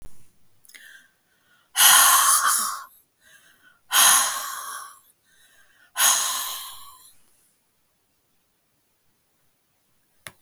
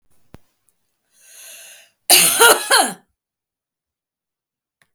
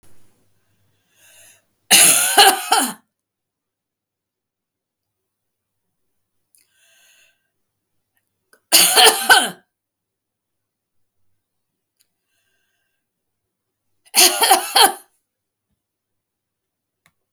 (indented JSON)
{
  "exhalation_length": "10.4 s",
  "exhalation_amplitude": 27132,
  "exhalation_signal_mean_std_ratio": 0.37,
  "three_cough_length": "4.9 s",
  "three_cough_amplitude": 32768,
  "three_cough_signal_mean_std_ratio": 0.3,
  "cough_length": "17.3 s",
  "cough_amplitude": 32768,
  "cough_signal_mean_std_ratio": 0.27,
  "survey_phase": "beta (2021-08-13 to 2022-03-07)",
  "age": "65+",
  "gender": "Female",
  "wearing_mask": "No",
  "symptom_none": true,
  "symptom_onset": "3 days",
  "smoker_status": "Never smoked",
  "respiratory_condition_asthma": false,
  "respiratory_condition_other": false,
  "recruitment_source": "REACT",
  "submission_delay": "2 days",
  "covid_test_result": "Negative",
  "covid_test_method": "RT-qPCR",
  "influenza_a_test_result": "Negative",
  "influenza_b_test_result": "Negative"
}